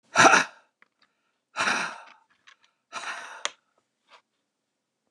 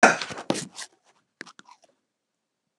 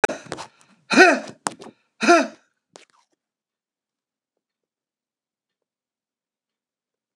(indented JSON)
{
  "exhalation_length": "5.1 s",
  "exhalation_amplitude": 25542,
  "exhalation_signal_mean_std_ratio": 0.27,
  "cough_length": "2.8 s",
  "cough_amplitude": 27837,
  "cough_signal_mean_std_ratio": 0.23,
  "three_cough_length": "7.2 s",
  "three_cough_amplitude": 29204,
  "three_cough_signal_mean_std_ratio": 0.22,
  "survey_phase": "beta (2021-08-13 to 2022-03-07)",
  "age": "65+",
  "gender": "Male",
  "wearing_mask": "No",
  "symptom_cough_any": true,
  "smoker_status": "Never smoked",
  "respiratory_condition_asthma": false,
  "respiratory_condition_other": false,
  "recruitment_source": "REACT",
  "submission_delay": "3 days",
  "covid_test_result": "Negative",
  "covid_test_method": "RT-qPCR",
  "influenza_a_test_result": "Negative",
  "influenza_b_test_result": "Negative"
}